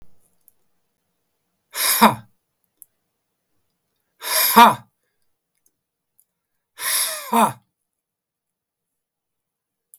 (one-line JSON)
{"exhalation_length": "10.0 s", "exhalation_amplitude": 32766, "exhalation_signal_mean_std_ratio": 0.26, "survey_phase": "beta (2021-08-13 to 2022-03-07)", "age": "65+", "gender": "Male", "wearing_mask": "No", "symptom_none": true, "smoker_status": "Ex-smoker", "respiratory_condition_asthma": false, "respiratory_condition_other": true, "recruitment_source": "REACT", "submission_delay": "1 day", "covid_test_result": "Negative", "covid_test_method": "RT-qPCR", "influenza_a_test_result": "Negative", "influenza_b_test_result": "Negative"}